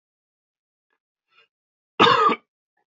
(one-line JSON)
{"cough_length": "3.0 s", "cough_amplitude": 26904, "cough_signal_mean_std_ratio": 0.27, "survey_phase": "beta (2021-08-13 to 2022-03-07)", "age": "45-64", "gender": "Male", "wearing_mask": "No", "symptom_none": true, "smoker_status": "Never smoked", "respiratory_condition_asthma": false, "respiratory_condition_other": false, "recruitment_source": "REACT", "submission_delay": "2 days", "covid_test_result": "Negative", "covid_test_method": "RT-qPCR"}